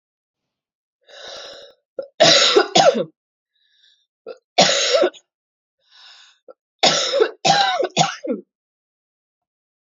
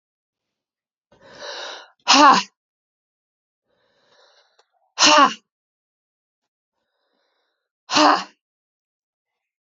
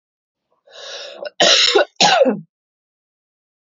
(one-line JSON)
{"three_cough_length": "9.9 s", "three_cough_amplitude": 32768, "three_cough_signal_mean_std_ratio": 0.4, "exhalation_length": "9.6 s", "exhalation_amplitude": 29865, "exhalation_signal_mean_std_ratio": 0.25, "cough_length": "3.7 s", "cough_amplitude": 31947, "cough_signal_mean_std_ratio": 0.42, "survey_phase": "beta (2021-08-13 to 2022-03-07)", "age": "18-44", "gender": "Female", "wearing_mask": "No", "symptom_cough_any": true, "symptom_runny_or_blocked_nose": true, "symptom_fatigue": true, "symptom_fever_high_temperature": true, "symptom_headache": true, "symptom_change_to_sense_of_smell_or_taste": true, "symptom_loss_of_taste": true, "symptom_other": true, "smoker_status": "Never smoked", "respiratory_condition_asthma": false, "respiratory_condition_other": false, "recruitment_source": "Test and Trace", "submission_delay": "2 days", "covid_test_result": "Positive", "covid_test_method": "RT-qPCR", "covid_ct_value": 22.5, "covid_ct_gene": "N gene", "covid_ct_mean": 23.2, "covid_viral_load": "25000 copies/ml", "covid_viral_load_category": "Low viral load (10K-1M copies/ml)"}